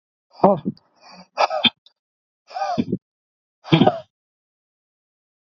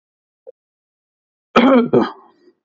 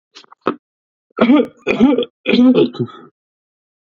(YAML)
exhalation_length: 5.5 s
exhalation_amplitude: 32767
exhalation_signal_mean_std_ratio: 0.31
cough_length: 2.6 s
cough_amplitude: 32625
cough_signal_mean_std_ratio: 0.35
three_cough_length: 3.9 s
three_cough_amplitude: 32767
three_cough_signal_mean_std_ratio: 0.47
survey_phase: beta (2021-08-13 to 2022-03-07)
age: 18-44
gender: Male
wearing_mask: 'No'
symptom_none: true
smoker_status: Ex-smoker
respiratory_condition_asthma: false
respiratory_condition_other: false
recruitment_source: REACT
submission_delay: 1 day
covid_test_result: Negative
covid_test_method: RT-qPCR
covid_ct_value: 39.0
covid_ct_gene: N gene
influenza_a_test_result: Negative
influenza_b_test_result: Negative